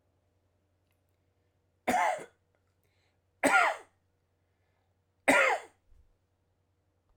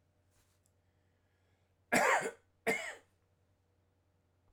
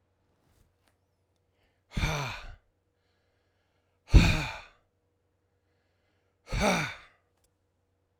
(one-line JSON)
{"three_cough_length": "7.2 s", "three_cough_amplitude": 11553, "three_cough_signal_mean_std_ratio": 0.29, "cough_length": "4.5 s", "cough_amplitude": 7379, "cough_signal_mean_std_ratio": 0.29, "exhalation_length": "8.2 s", "exhalation_amplitude": 18208, "exhalation_signal_mean_std_ratio": 0.25, "survey_phase": "alpha (2021-03-01 to 2021-08-12)", "age": "45-64", "gender": "Male", "wearing_mask": "No", "symptom_none": true, "smoker_status": "Never smoked", "respiratory_condition_asthma": false, "respiratory_condition_other": false, "recruitment_source": "REACT", "submission_delay": "5 days", "covid_test_result": "Negative", "covid_test_method": "RT-qPCR"}